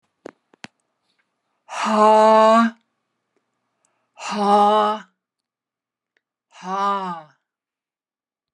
{"exhalation_length": "8.5 s", "exhalation_amplitude": 22581, "exhalation_signal_mean_std_ratio": 0.4, "survey_phase": "alpha (2021-03-01 to 2021-08-12)", "age": "65+", "gender": "Female", "wearing_mask": "No", "symptom_none": true, "smoker_status": "Never smoked", "respiratory_condition_asthma": false, "respiratory_condition_other": false, "recruitment_source": "REACT", "submission_delay": "1 day", "covid_test_result": "Negative", "covid_test_method": "RT-qPCR"}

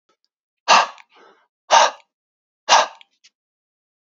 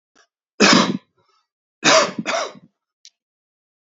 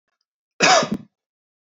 {"exhalation_length": "4.0 s", "exhalation_amplitude": 29891, "exhalation_signal_mean_std_ratio": 0.29, "three_cough_length": "3.8 s", "three_cough_amplitude": 31476, "three_cough_signal_mean_std_ratio": 0.36, "cough_length": "1.7 s", "cough_amplitude": 27105, "cough_signal_mean_std_ratio": 0.34, "survey_phase": "beta (2021-08-13 to 2022-03-07)", "age": "45-64", "gender": "Male", "wearing_mask": "No", "symptom_cough_any": true, "smoker_status": "Ex-smoker", "respiratory_condition_asthma": false, "respiratory_condition_other": false, "recruitment_source": "REACT", "submission_delay": "6 days", "covid_test_result": "Negative", "covid_test_method": "RT-qPCR"}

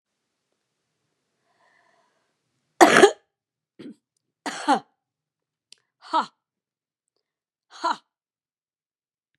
{"exhalation_length": "9.4 s", "exhalation_amplitude": 32768, "exhalation_signal_mean_std_ratio": 0.19, "survey_phase": "beta (2021-08-13 to 2022-03-07)", "age": "65+", "gender": "Female", "wearing_mask": "No", "symptom_cough_any": true, "symptom_sore_throat": true, "symptom_fatigue": true, "symptom_headache": true, "symptom_onset": "8 days", "smoker_status": "Never smoked", "respiratory_condition_asthma": false, "respiratory_condition_other": false, "recruitment_source": "Test and Trace", "submission_delay": "3 days", "covid_test_result": "Negative", "covid_test_method": "ePCR"}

